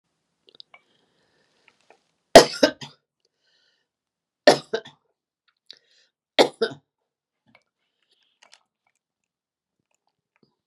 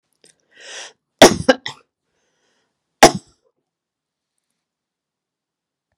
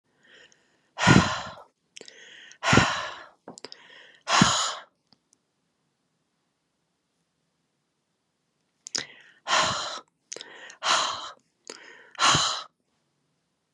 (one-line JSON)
{"three_cough_length": "10.7 s", "three_cough_amplitude": 32768, "three_cough_signal_mean_std_ratio": 0.14, "cough_length": "6.0 s", "cough_amplitude": 32768, "cough_signal_mean_std_ratio": 0.17, "exhalation_length": "13.7 s", "exhalation_amplitude": 25968, "exhalation_signal_mean_std_ratio": 0.33, "survey_phase": "beta (2021-08-13 to 2022-03-07)", "age": "65+", "gender": "Female", "wearing_mask": "No", "symptom_runny_or_blocked_nose": true, "smoker_status": "Current smoker (1 to 10 cigarettes per day)", "respiratory_condition_asthma": false, "respiratory_condition_other": false, "recruitment_source": "REACT", "submission_delay": "13 days", "covid_test_result": "Negative", "covid_test_method": "RT-qPCR"}